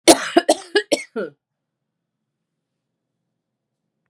{"three_cough_length": "4.1 s", "three_cough_amplitude": 32768, "three_cough_signal_mean_std_ratio": 0.24, "survey_phase": "beta (2021-08-13 to 2022-03-07)", "age": "45-64", "gender": "Female", "wearing_mask": "No", "symptom_cough_any": true, "symptom_runny_or_blocked_nose": true, "symptom_sore_throat": true, "symptom_abdominal_pain": true, "symptom_diarrhoea": true, "symptom_fatigue": true, "symptom_headache": true, "symptom_change_to_sense_of_smell_or_taste": true, "symptom_loss_of_taste": true, "symptom_other": true, "symptom_onset": "4 days", "smoker_status": "Ex-smoker", "respiratory_condition_asthma": true, "respiratory_condition_other": false, "recruitment_source": "Test and Trace", "submission_delay": "2 days", "covid_test_result": "Positive", "covid_test_method": "RT-qPCR", "covid_ct_value": 20.9, "covid_ct_gene": "S gene"}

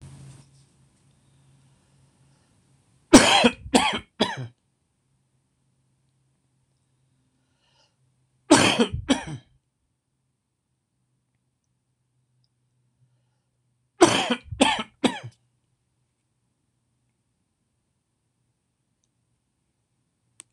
{"three_cough_length": "20.5 s", "three_cough_amplitude": 26028, "three_cough_signal_mean_std_ratio": 0.22, "survey_phase": "beta (2021-08-13 to 2022-03-07)", "age": "45-64", "gender": "Male", "wearing_mask": "No", "symptom_cough_any": true, "symptom_runny_or_blocked_nose": true, "symptom_headache": true, "smoker_status": "Never smoked", "respiratory_condition_asthma": false, "respiratory_condition_other": false, "recruitment_source": "Test and Trace", "submission_delay": "1 day", "covid_test_result": "Positive", "covid_test_method": "RT-qPCR"}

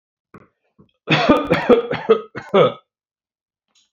{"cough_length": "3.9 s", "cough_amplitude": 32767, "cough_signal_mean_std_ratio": 0.41, "survey_phase": "beta (2021-08-13 to 2022-03-07)", "age": "65+", "gender": "Male", "wearing_mask": "No", "symptom_none": true, "smoker_status": "Never smoked", "respiratory_condition_asthma": false, "respiratory_condition_other": false, "recruitment_source": "REACT", "submission_delay": "6 days", "covid_test_result": "Negative", "covid_test_method": "RT-qPCR", "influenza_a_test_result": "Negative", "influenza_b_test_result": "Negative"}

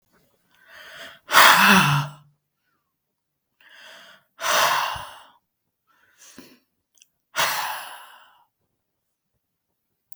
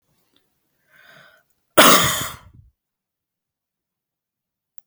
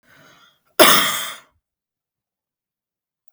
{"exhalation_length": "10.2 s", "exhalation_amplitude": 32768, "exhalation_signal_mean_std_ratio": 0.31, "cough_length": "4.9 s", "cough_amplitude": 32768, "cough_signal_mean_std_ratio": 0.23, "three_cough_length": "3.3 s", "three_cough_amplitude": 32768, "three_cough_signal_mean_std_ratio": 0.27, "survey_phase": "beta (2021-08-13 to 2022-03-07)", "age": "65+", "gender": "Female", "wearing_mask": "No", "symptom_none": true, "smoker_status": "Never smoked", "respiratory_condition_asthma": false, "respiratory_condition_other": false, "recruitment_source": "REACT", "submission_delay": "3 days", "covid_test_result": "Negative", "covid_test_method": "RT-qPCR"}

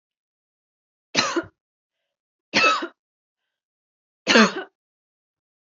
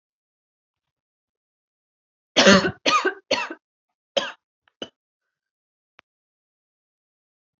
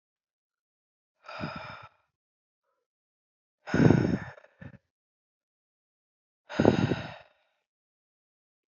{"three_cough_length": "5.6 s", "three_cough_amplitude": 26741, "three_cough_signal_mean_std_ratio": 0.28, "cough_length": "7.6 s", "cough_amplitude": 27319, "cough_signal_mean_std_ratio": 0.24, "exhalation_length": "8.7 s", "exhalation_amplitude": 21943, "exhalation_signal_mean_std_ratio": 0.25, "survey_phase": "alpha (2021-03-01 to 2021-08-12)", "age": "18-44", "gender": "Female", "wearing_mask": "No", "symptom_none": true, "smoker_status": "Never smoked", "respiratory_condition_asthma": false, "respiratory_condition_other": false, "recruitment_source": "REACT", "submission_delay": "1 day", "covid_test_result": "Negative", "covid_test_method": "RT-qPCR"}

